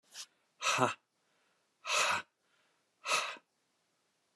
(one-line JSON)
{"exhalation_length": "4.4 s", "exhalation_amplitude": 8356, "exhalation_signal_mean_std_ratio": 0.38, "survey_phase": "beta (2021-08-13 to 2022-03-07)", "age": "45-64", "gender": "Male", "wearing_mask": "No", "symptom_none": true, "smoker_status": "Never smoked", "respiratory_condition_asthma": false, "respiratory_condition_other": false, "recruitment_source": "REACT", "submission_delay": "1 day", "covid_test_result": "Negative", "covid_test_method": "RT-qPCR"}